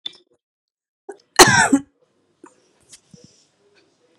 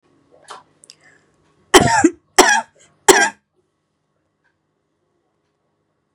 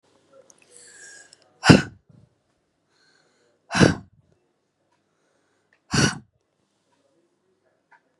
{"cough_length": "4.2 s", "cough_amplitude": 32768, "cough_signal_mean_std_ratio": 0.23, "three_cough_length": "6.1 s", "three_cough_amplitude": 32768, "three_cough_signal_mean_std_ratio": 0.27, "exhalation_length": "8.2 s", "exhalation_amplitude": 32768, "exhalation_signal_mean_std_ratio": 0.19, "survey_phase": "beta (2021-08-13 to 2022-03-07)", "age": "45-64", "gender": "Female", "wearing_mask": "No", "symptom_none": true, "smoker_status": "Never smoked", "respiratory_condition_asthma": false, "respiratory_condition_other": false, "recruitment_source": "REACT", "submission_delay": "1 day", "covid_test_result": "Negative", "covid_test_method": "RT-qPCR", "influenza_a_test_result": "Negative", "influenza_b_test_result": "Negative"}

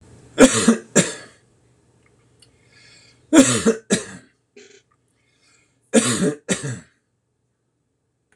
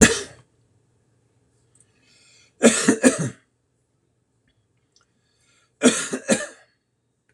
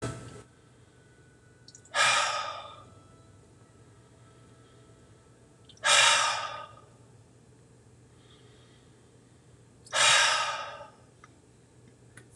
{"three_cough_length": "8.4 s", "three_cough_amplitude": 26028, "three_cough_signal_mean_std_ratio": 0.32, "cough_length": "7.3 s", "cough_amplitude": 26028, "cough_signal_mean_std_ratio": 0.28, "exhalation_length": "12.4 s", "exhalation_amplitude": 12715, "exhalation_signal_mean_std_ratio": 0.36, "survey_phase": "beta (2021-08-13 to 2022-03-07)", "age": "65+", "gender": "Male", "wearing_mask": "No", "symptom_none": true, "smoker_status": "Ex-smoker", "respiratory_condition_asthma": false, "respiratory_condition_other": false, "recruitment_source": "REACT", "submission_delay": "1 day", "covid_test_result": "Negative", "covid_test_method": "RT-qPCR", "influenza_a_test_result": "Negative", "influenza_b_test_result": "Negative"}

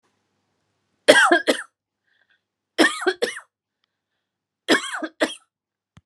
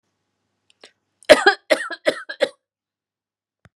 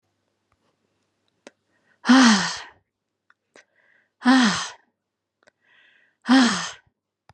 {"three_cough_length": "6.1 s", "three_cough_amplitude": 32768, "three_cough_signal_mean_std_ratio": 0.31, "cough_length": "3.8 s", "cough_amplitude": 32768, "cough_signal_mean_std_ratio": 0.24, "exhalation_length": "7.3 s", "exhalation_amplitude": 26334, "exhalation_signal_mean_std_ratio": 0.33, "survey_phase": "beta (2021-08-13 to 2022-03-07)", "age": "45-64", "gender": "Female", "wearing_mask": "No", "symptom_none": true, "smoker_status": "Never smoked", "respiratory_condition_asthma": false, "respiratory_condition_other": false, "recruitment_source": "REACT", "submission_delay": "3 days", "covid_test_result": "Negative", "covid_test_method": "RT-qPCR", "influenza_a_test_result": "Negative", "influenza_b_test_result": "Negative"}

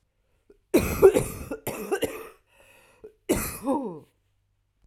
{"cough_length": "4.9 s", "cough_amplitude": 22474, "cough_signal_mean_std_ratio": 0.37, "survey_phase": "alpha (2021-03-01 to 2021-08-12)", "age": "45-64", "gender": "Female", "wearing_mask": "No", "symptom_cough_any": true, "symptom_shortness_of_breath": true, "symptom_fatigue": true, "symptom_headache": true, "smoker_status": "Current smoker (1 to 10 cigarettes per day)", "respiratory_condition_asthma": false, "respiratory_condition_other": false, "recruitment_source": "Test and Trace", "submission_delay": "1 day", "covid_test_result": "Positive", "covid_test_method": "RT-qPCR", "covid_ct_value": 15.2, "covid_ct_gene": "S gene", "covid_ct_mean": 15.6, "covid_viral_load": "7600000 copies/ml", "covid_viral_load_category": "High viral load (>1M copies/ml)"}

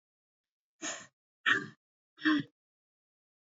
{"exhalation_length": "3.4 s", "exhalation_amplitude": 6551, "exhalation_signal_mean_std_ratio": 0.29, "survey_phase": "beta (2021-08-13 to 2022-03-07)", "age": "45-64", "gender": "Male", "wearing_mask": "No", "symptom_none": true, "symptom_onset": "10 days", "smoker_status": "Never smoked", "respiratory_condition_asthma": false, "respiratory_condition_other": false, "recruitment_source": "REACT", "submission_delay": "0 days", "covid_test_result": "Negative", "covid_test_method": "RT-qPCR", "influenza_a_test_result": "Negative", "influenza_b_test_result": "Negative"}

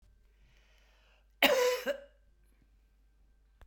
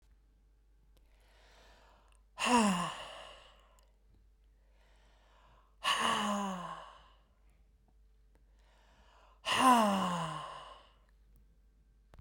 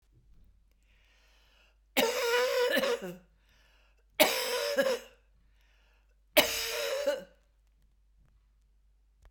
{"cough_length": "3.7 s", "cough_amplitude": 11328, "cough_signal_mean_std_ratio": 0.31, "exhalation_length": "12.2 s", "exhalation_amplitude": 6791, "exhalation_signal_mean_std_ratio": 0.37, "three_cough_length": "9.3 s", "three_cough_amplitude": 18977, "three_cough_signal_mean_std_ratio": 0.44, "survey_phase": "beta (2021-08-13 to 2022-03-07)", "age": "65+", "gender": "Female", "wearing_mask": "No", "symptom_cough_any": true, "symptom_runny_or_blocked_nose": true, "symptom_fatigue": true, "symptom_headache": true, "smoker_status": "Never smoked", "respiratory_condition_asthma": false, "respiratory_condition_other": true, "recruitment_source": "Test and Trace", "submission_delay": "2 days", "covid_test_result": "Positive", "covid_test_method": "RT-qPCR", "covid_ct_value": 24.3, "covid_ct_gene": "ORF1ab gene"}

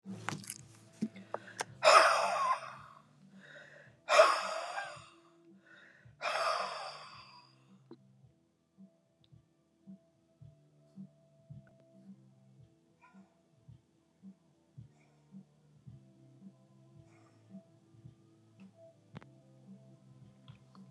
{"exhalation_length": "20.9 s", "exhalation_amplitude": 12365, "exhalation_signal_mean_std_ratio": 0.27, "survey_phase": "alpha (2021-03-01 to 2021-08-12)", "age": "65+", "gender": "Female", "wearing_mask": "No", "symptom_none": true, "smoker_status": "Never smoked", "respiratory_condition_asthma": false, "respiratory_condition_other": false, "recruitment_source": "REACT", "submission_delay": "1 day", "covid_test_result": "Negative", "covid_test_method": "RT-qPCR"}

